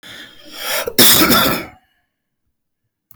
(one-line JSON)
{"cough_length": "3.2 s", "cough_amplitude": 32768, "cough_signal_mean_std_ratio": 0.44, "survey_phase": "beta (2021-08-13 to 2022-03-07)", "age": "45-64", "gender": "Male", "wearing_mask": "No", "symptom_fatigue": true, "symptom_onset": "12 days", "smoker_status": "Ex-smoker", "respiratory_condition_asthma": false, "respiratory_condition_other": false, "recruitment_source": "REACT", "submission_delay": "1 day", "covid_test_result": "Negative", "covid_test_method": "RT-qPCR"}